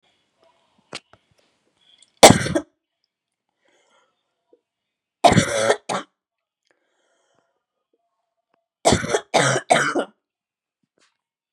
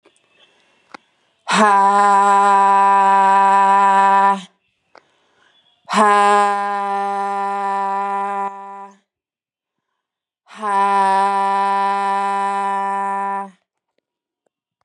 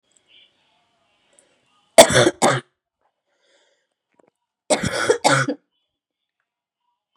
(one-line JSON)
{"three_cough_length": "11.5 s", "three_cough_amplitude": 32768, "three_cough_signal_mean_std_ratio": 0.26, "exhalation_length": "14.8 s", "exhalation_amplitude": 31804, "exhalation_signal_mean_std_ratio": 0.65, "cough_length": "7.2 s", "cough_amplitude": 32768, "cough_signal_mean_std_ratio": 0.27, "survey_phase": "beta (2021-08-13 to 2022-03-07)", "age": "18-44", "gender": "Female", "wearing_mask": "No", "symptom_cough_any": true, "symptom_runny_or_blocked_nose": true, "symptom_shortness_of_breath": true, "symptom_sore_throat": true, "symptom_diarrhoea": true, "symptom_fatigue": true, "symptom_fever_high_temperature": true, "smoker_status": "Never smoked", "respiratory_condition_asthma": true, "respiratory_condition_other": false, "recruitment_source": "Test and Trace", "submission_delay": "2 days", "covid_test_result": "Positive", "covid_test_method": "ePCR"}